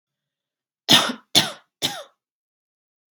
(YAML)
three_cough_length: 3.2 s
three_cough_amplitude: 32767
three_cough_signal_mean_std_ratio: 0.27
survey_phase: beta (2021-08-13 to 2022-03-07)
age: 18-44
gender: Female
wearing_mask: 'Yes'
symptom_cough_any: true
symptom_runny_or_blocked_nose: true
symptom_headache: true
smoker_status: Never smoked
respiratory_condition_asthma: false
respiratory_condition_other: false
recruitment_source: Test and Trace
submission_delay: 1 day
covid_test_result: Positive
covid_test_method: ePCR